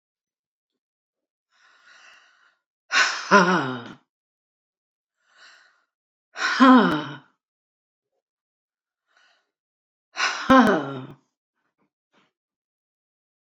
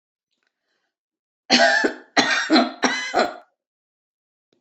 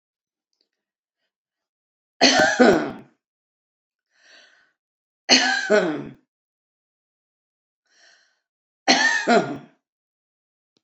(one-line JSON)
{"exhalation_length": "13.6 s", "exhalation_amplitude": 26483, "exhalation_signal_mean_std_ratio": 0.28, "cough_length": "4.6 s", "cough_amplitude": 26865, "cough_signal_mean_std_ratio": 0.43, "three_cough_length": "10.8 s", "three_cough_amplitude": 28482, "three_cough_signal_mean_std_ratio": 0.33, "survey_phase": "beta (2021-08-13 to 2022-03-07)", "age": "65+", "gender": "Female", "wearing_mask": "No", "symptom_none": true, "smoker_status": "Never smoked", "respiratory_condition_asthma": false, "respiratory_condition_other": false, "recruitment_source": "REACT", "submission_delay": "3 days", "covid_test_result": "Negative", "covid_test_method": "RT-qPCR", "influenza_a_test_result": "Negative", "influenza_b_test_result": "Negative"}